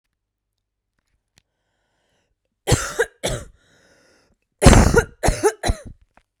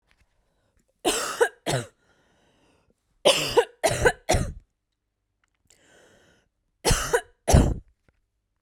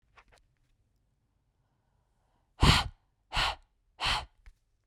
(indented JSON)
{
  "cough_length": "6.4 s",
  "cough_amplitude": 32768,
  "cough_signal_mean_std_ratio": 0.3,
  "three_cough_length": "8.6 s",
  "three_cough_amplitude": 21114,
  "three_cough_signal_mean_std_ratio": 0.35,
  "exhalation_length": "4.9 s",
  "exhalation_amplitude": 12784,
  "exhalation_signal_mean_std_ratio": 0.27,
  "survey_phase": "beta (2021-08-13 to 2022-03-07)",
  "age": "18-44",
  "gender": "Female",
  "wearing_mask": "No",
  "symptom_cough_any": true,
  "symptom_onset": "12 days",
  "smoker_status": "Never smoked",
  "respiratory_condition_asthma": true,
  "respiratory_condition_other": false,
  "recruitment_source": "REACT",
  "submission_delay": "1 day",
  "covid_test_result": "Negative",
  "covid_test_method": "RT-qPCR"
}